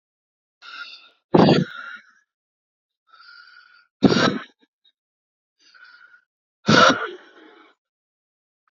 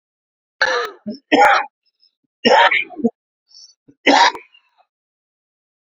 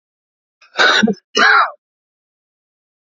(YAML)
exhalation_length: 8.7 s
exhalation_amplitude: 27409
exhalation_signal_mean_std_ratio: 0.28
three_cough_length: 5.8 s
three_cough_amplitude: 31252
three_cough_signal_mean_std_ratio: 0.38
cough_length: 3.1 s
cough_amplitude: 31644
cough_signal_mean_std_ratio: 0.4
survey_phase: beta (2021-08-13 to 2022-03-07)
age: 45-64
gender: Male
wearing_mask: 'No'
symptom_sore_throat: true
symptom_onset: 3 days
smoker_status: Never smoked
respiratory_condition_asthma: true
respiratory_condition_other: false
recruitment_source: Test and Trace
submission_delay: 2 days
covid_test_result: Positive
covid_test_method: RT-qPCR
covid_ct_value: 20.4
covid_ct_gene: N gene